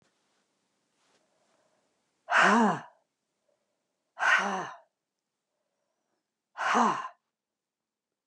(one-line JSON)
{"exhalation_length": "8.3 s", "exhalation_amplitude": 11285, "exhalation_signal_mean_std_ratio": 0.32, "survey_phase": "beta (2021-08-13 to 2022-03-07)", "age": "65+", "gender": "Female", "wearing_mask": "No", "symptom_cough_any": true, "symptom_shortness_of_breath": true, "symptom_onset": "12 days", "smoker_status": "Never smoked", "respiratory_condition_asthma": true, "respiratory_condition_other": false, "recruitment_source": "REACT", "submission_delay": "4 days", "covid_test_result": "Negative", "covid_test_method": "RT-qPCR", "influenza_a_test_result": "Negative", "influenza_b_test_result": "Negative"}